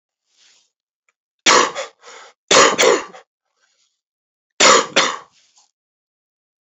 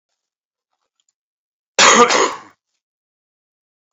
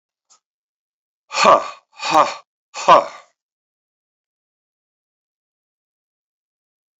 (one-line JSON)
{"three_cough_length": "6.7 s", "three_cough_amplitude": 32768, "three_cough_signal_mean_std_ratio": 0.34, "cough_length": "3.9 s", "cough_amplitude": 32767, "cough_signal_mean_std_ratio": 0.29, "exhalation_length": "7.0 s", "exhalation_amplitude": 31870, "exhalation_signal_mean_std_ratio": 0.24, "survey_phase": "beta (2021-08-13 to 2022-03-07)", "age": "65+", "gender": "Male", "wearing_mask": "No", "symptom_cough_any": true, "symptom_fatigue": true, "symptom_headache": true, "symptom_loss_of_taste": true, "symptom_onset": "5 days", "smoker_status": "Ex-smoker", "respiratory_condition_asthma": false, "respiratory_condition_other": false, "recruitment_source": "Test and Trace", "submission_delay": "2 days", "covid_test_result": "Positive", "covid_test_method": "RT-qPCR", "covid_ct_value": 14.6, "covid_ct_gene": "ORF1ab gene", "covid_ct_mean": 14.8, "covid_viral_load": "14000000 copies/ml", "covid_viral_load_category": "High viral load (>1M copies/ml)"}